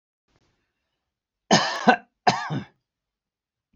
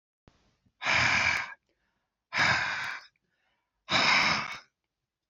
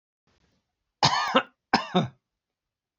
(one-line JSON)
{"three_cough_length": "3.8 s", "three_cough_amplitude": 25896, "three_cough_signal_mean_std_ratio": 0.29, "exhalation_length": "5.3 s", "exhalation_amplitude": 9022, "exhalation_signal_mean_std_ratio": 0.5, "cough_length": "3.0 s", "cough_amplitude": 18512, "cough_signal_mean_std_ratio": 0.34, "survey_phase": "beta (2021-08-13 to 2022-03-07)", "age": "65+", "gender": "Male", "wearing_mask": "No", "symptom_none": true, "smoker_status": "Ex-smoker", "respiratory_condition_asthma": false, "respiratory_condition_other": false, "recruitment_source": "REACT", "submission_delay": "2 days", "covid_test_result": "Negative", "covid_test_method": "RT-qPCR", "influenza_a_test_result": "Negative", "influenza_b_test_result": "Negative"}